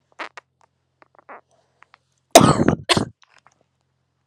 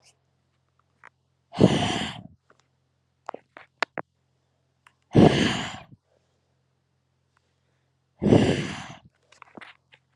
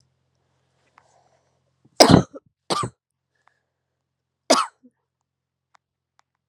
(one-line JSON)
{"cough_length": "4.3 s", "cough_amplitude": 32768, "cough_signal_mean_std_ratio": 0.24, "exhalation_length": "10.2 s", "exhalation_amplitude": 26775, "exhalation_signal_mean_std_ratio": 0.28, "three_cough_length": "6.5 s", "three_cough_amplitude": 32768, "three_cough_signal_mean_std_ratio": 0.19, "survey_phase": "alpha (2021-03-01 to 2021-08-12)", "age": "18-44", "gender": "Female", "wearing_mask": "No", "symptom_cough_any": true, "symptom_shortness_of_breath": true, "symptom_fatigue": true, "symptom_headache": true, "symptom_onset": "2 days", "smoker_status": "Never smoked", "respiratory_condition_asthma": false, "respiratory_condition_other": false, "recruitment_source": "Test and Trace", "submission_delay": "2 days", "covid_test_result": "Positive", "covid_test_method": "RT-qPCR", "covid_ct_value": 14.8, "covid_ct_gene": "ORF1ab gene", "covid_ct_mean": 15.0, "covid_viral_load": "12000000 copies/ml", "covid_viral_load_category": "High viral load (>1M copies/ml)"}